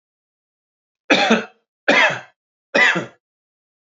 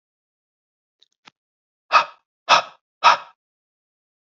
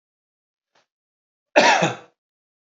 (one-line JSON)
{"three_cough_length": "3.9 s", "three_cough_amplitude": 30825, "three_cough_signal_mean_std_ratio": 0.38, "exhalation_length": "4.3 s", "exhalation_amplitude": 28734, "exhalation_signal_mean_std_ratio": 0.23, "cough_length": "2.7 s", "cough_amplitude": 28937, "cough_signal_mean_std_ratio": 0.28, "survey_phase": "alpha (2021-03-01 to 2021-08-12)", "age": "45-64", "gender": "Male", "wearing_mask": "No", "symptom_none": true, "smoker_status": "Never smoked", "respiratory_condition_asthma": false, "respiratory_condition_other": false, "recruitment_source": "REACT", "submission_delay": "2 days", "covid_test_result": "Negative", "covid_test_method": "RT-qPCR"}